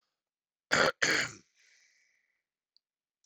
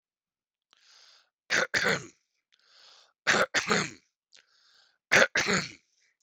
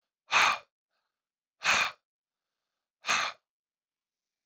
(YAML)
cough_length: 3.3 s
cough_amplitude: 9860
cough_signal_mean_std_ratio: 0.28
three_cough_length: 6.2 s
three_cough_amplitude: 23577
three_cough_signal_mean_std_ratio: 0.34
exhalation_length: 4.5 s
exhalation_amplitude: 9673
exhalation_signal_mean_std_ratio: 0.31
survey_phase: beta (2021-08-13 to 2022-03-07)
age: 45-64
gender: Male
wearing_mask: 'No'
symptom_sore_throat: true
symptom_onset: 4 days
smoker_status: Never smoked
respiratory_condition_asthma: false
respiratory_condition_other: false
recruitment_source: REACT
submission_delay: 10 days
covid_test_result: Negative
covid_test_method: RT-qPCR
influenza_a_test_result: Negative
influenza_b_test_result: Negative